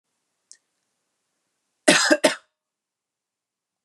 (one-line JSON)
{"cough_length": "3.8 s", "cough_amplitude": 28175, "cough_signal_mean_std_ratio": 0.23, "survey_phase": "beta (2021-08-13 to 2022-03-07)", "age": "18-44", "gender": "Female", "wearing_mask": "No", "symptom_none": true, "smoker_status": "Never smoked", "respiratory_condition_asthma": false, "respiratory_condition_other": false, "recruitment_source": "REACT", "submission_delay": "2 days", "covid_test_result": "Negative", "covid_test_method": "RT-qPCR", "influenza_a_test_result": "Negative", "influenza_b_test_result": "Negative"}